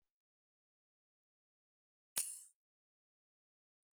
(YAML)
cough_length: 3.9 s
cough_amplitude: 8186
cough_signal_mean_std_ratio: 0.15
survey_phase: beta (2021-08-13 to 2022-03-07)
age: 65+
gender: Female
wearing_mask: 'No'
symptom_none: true
smoker_status: Never smoked
respiratory_condition_asthma: false
respiratory_condition_other: false
recruitment_source: REACT
submission_delay: 1 day
covid_test_result: Negative
covid_test_method: RT-qPCR
influenza_a_test_result: Negative
influenza_b_test_result: Negative